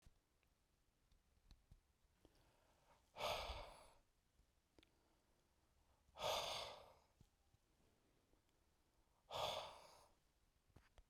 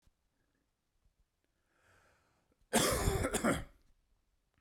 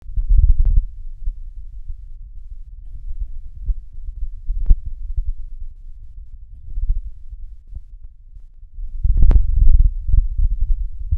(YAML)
exhalation_length: 11.1 s
exhalation_amplitude: 791
exhalation_signal_mean_std_ratio: 0.35
cough_length: 4.6 s
cough_amplitude: 5398
cough_signal_mean_std_ratio: 0.35
three_cough_length: 11.2 s
three_cough_amplitude: 32768
three_cough_signal_mean_std_ratio: 0.57
survey_phase: beta (2021-08-13 to 2022-03-07)
age: 18-44
gender: Male
wearing_mask: 'No'
symptom_cough_any: true
smoker_status: Never smoked
respiratory_condition_asthma: false
respiratory_condition_other: false
recruitment_source: REACT
submission_delay: 2 days
covid_test_result: Negative
covid_test_method: RT-qPCR